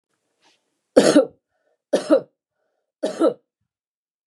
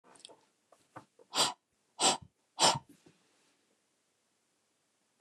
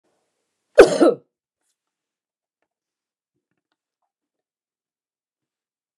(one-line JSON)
{"three_cough_length": "4.3 s", "three_cough_amplitude": 29204, "three_cough_signal_mean_std_ratio": 0.3, "exhalation_length": "5.2 s", "exhalation_amplitude": 8291, "exhalation_signal_mean_std_ratio": 0.25, "cough_length": "6.0 s", "cough_amplitude": 29204, "cough_signal_mean_std_ratio": 0.16, "survey_phase": "beta (2021-08-13 to 2022-03-07)", "age": "65+", "gender": "Female", "wearing_mask": "No", "symptom_runny_or_blocked_nose": true, "symptom_onset": "12 days", "smoker_status": "Ex-smoker", "respiratory_condition_asthma": false, "respiratory_condition_other": false, "recruitment_source": "REACT", "submission_delay": "1 day", "covid_test_result": "Negative", "covid_test_method": "RT-qPCR", "influenza_a_test_result": "Negative", "influenza_b_test_result": "Negative"}